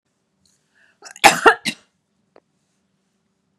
{
  "cough_length": "3.6 s",
  "cough_amplitude": 32768,
  "cough_signal_mean_std_ratio": 0.2,
  "survey_phase": "beta (2021-08-13 to 2022-03-07)",
  "age": "45-64",
  "gender": "Female",
  "wearing_mask": "No",
  "symptom_none": true,
  "smoker_status": "Never smoked",
  "respiratory_condition_asthma": false,
  "respiratory_condition_other": false,
  "recruitment_source": "REACT",
  "submission_delay": "2 days",
  "covid_test_result": "Negative",
  "covid_test_method": "RT-qPCR"
}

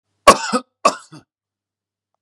{
  "cough_length": "2.2 s",
  "cough_amplitude": 32768,
  "cough_signal_mean_std_ratio": 0.25,
  "survey_phase": "beta (2021-08-13 to 2022-03-07)",
  "age": "18-44",
  "gender": "Male",
  "wearing_mask": "No",
  "symptom_none": true,
  "smoker_status": "Never smoked",
  "respiratory_condition_asthma": false,
  "respiratory_condition_other": false,
  "recruitment_source": "REACT",
  "submission_delay": "0 days",
  "covid_test_result": "Negative",
  "covid_test_method": "RT-qPCR",
  "influenza_a_test_result": "Negative",
  "influenza_b_test_result": "Negative"
}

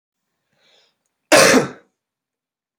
{
  "cough_length": "2.8 s",
  "cough_amplitude": 31459,
  "cough_signal_mean_std_ratio": 0.29,
  "survey_phase": "beta (2021-08-13 to 2022-03-07)",
  "age": "18-44",
  "gender": "Male",
  "wearing_mask": "No",
  "symptom_cough_any": true,
  "symptom_sore_throat": true,
  "symptom_other": true,
  "symptom_onset": "2 days",
  "smoker_status": "Never smoked",
  "respiratory_condition_asthma": false,
  "respiratory_condition_other": false,
  "recruitment_source": "Test and Trace",
  "submission_delay": "1 day",
  "covid_test_result": "Positive",
  "covid_test_method": "RT-qPCR",
  "covid_ct_value": 20.1,
  "covid_ct_gene": "ORF1ab gene"
}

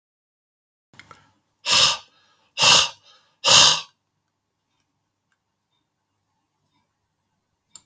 {
  "exhalation_length": "7.9 s",
  "exhalation_amplitude": 32313,
  "exhalation_signal_mean_std_ratio": 0.27,
  "survey_phase": "beta (2021-08-13 to 2022-03-07)",
  "age": "65+",
  "gender": "Male",
  "wearing_mask": "No",
  "symptom_none": true,
  "smoker_status": "Ex-smoker",
  "respiratory_condition_asthma": false,
  "respiratory_condition_other": false,
  "recruitment_source": "Test and Trace",
  "submission_delay": "1 day",
  "covid_test_result": "Negative",
  "covid_test_method": "RT-qPCR"
}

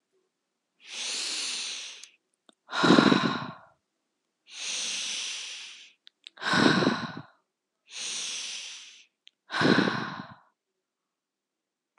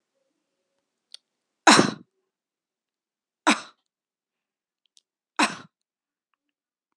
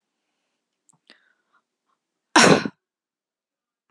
{
  "exhalation_length": "12.0 s",
  "exhalation_amplitude": 23365,
  "exhalation_signal_mean_std_ratio": 0.43,
  "three_cough_length": "7.0 s",
  "three_cough_amplitude": 31677,
  "three_cough_signal_mean_std_ratio": 0.18,
  "cough_length": "3.9 s",
  "cough_amplitude": 29343,
  "cough_signal_mean_std_ratio": 0.2,
  "survey_phase": "beta (2021-08-13 to 2022-03-07)",
  "age": "18-44",
  "gender": "Female",
  "wearing_mask": "No",
  "symptom_none": true,
  "smoker_status": "Never smoked",
  "respiratory_condition_asthma": false,
  "respiratory_condition_other": false,
  "recruitment_source": "REACT",
  "submission_delay": "3 days",
  "covid_test_result": "Negative",
  "covid_test_method": "RT-qPCR",
  "influenza_a_test_result": "Negative",
  "influenza_b_test_result": "Negative"
}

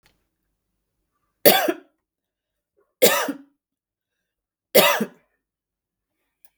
{
  "three_cough_length": "6.6 s",
  "three_cough_amplitude": 32768,
  "three_cough_signal_mean_std_ratio": 0.26,
  "survey_phase": "beta (2021-08-13 to 2022-03-07)",
  "age": "45-64",
  "gender": "Female",
  "wearing_mask": "No",
  "symptom_none": true,
  "smoker_status": "Never smoked",
  "respiratory_condition_asthma": false,
  "respiratory_condition_other": true,
  "recruitment_source": "REACT",
  "submission_delay": "0 days",
  "covid_test_result": "Negative",
  "covid_test_method": "RT-qPCR",
  "influenza_a_test_result": "Negative",
  "influenza_b_test_result": "Negative"
}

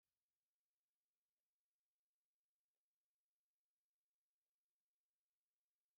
{
  "three_cough_length": "6.0 s",
  "three_cough_amplitude": 2,
  "three_cough_signal_mean_std_ratio": 0.19,
  "survey_phase": "beta (2021-08-13 to 2022-03-07)",
  "age": "65+",
  "gender": "Female",
  "wearing_mask": "No",
  "symptom_none": true,
  "smoker_status": "Ex-smoker",
  "respiratory_condition_asthma": false,
  "respiratory_condition_other": false,
  "recruitment_source": "REACT",
  "submission_delay": "3 days",
  "covid_test_result": "Negative",
  "covid_test_method": "RT-qPCR"
}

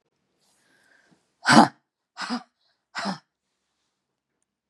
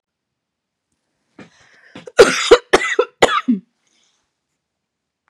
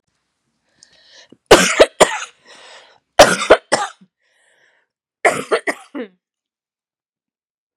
{
  "exhalation_length": "4.7 s",
  "exhalation_amplitude": 32719,
  "exhalation_signal_mean_std_ratio": 0.21,
  "cough_length": "5.3 s",
  "cough_amplitude": 32768,
  "cough_signal_mean_std_ratio": 0.28,
  "three_cough_length": "7.8 s",
  "three_cough_amplitude": 32768,
  "three_cough_signal_mean_std_ratio": 0.28,
  "survey_phase": "beta (2021-08-13 to 2022-03-07)",
  "age": "18-44",
  "gender": "Female",
  "wearing_mask": "No",
  "symptom_cough_any": true,
  "symptom_new_continuous_cough": true,
  "symptom_shortness_of_breath": true,
  "symptom_sore_throat": true,
  "symptom_fatigue": true,
  "symptom_headache": true,
  "symptom_onset": "2 days",
  "smoker_status": "Never smoked",
  "respiratory_condition_asthma": true,
  "respiratory_condition_other": false,
  "recruitment_source": "Test and Trace",
  "submission_delay": "0 days",
  "covid_test_result": "Positive",
  "covid_test_method": "RT-qPCR",
  "covid_ct_value": 21.8,
  "covid_ct_gene": "N gene"
}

